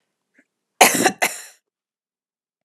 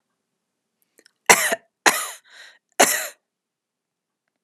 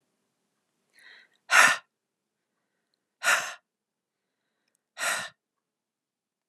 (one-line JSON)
{"cough_length": "2.6 s", "cough_amplitude": 32768, "cough_signal_mean_std_ratio": 0.27, "three_cough_length": "4.4 s", "three_cough_amplitude": 32768, "three_cough_signal_mean_std_ratio": 0.26, "exhalation_length": "6.5 s", "exhalation_amplitude": 24375, "exhalation_signal_mean_std_ratio": 0.24, "survey_phase": "beta (2021-08-13 to 2022-03-07)", "age": "45-64", "gender": "Female", "wearing_mask": "No", "symptom_fatigue": true, "symptom_onset": "12 days", "smoker_status": "Never smoked", "respiratory_condition_asthma": false, "respiratory_condition_other": false, "recruitment_source": "REACT", "submission_delay": "3 days", "covid_test_result": "Negative", "covid_test_method": "RT-qPCR", "influenza_a_test_result": "Negative", "influenza_b_test_result": "Negative"}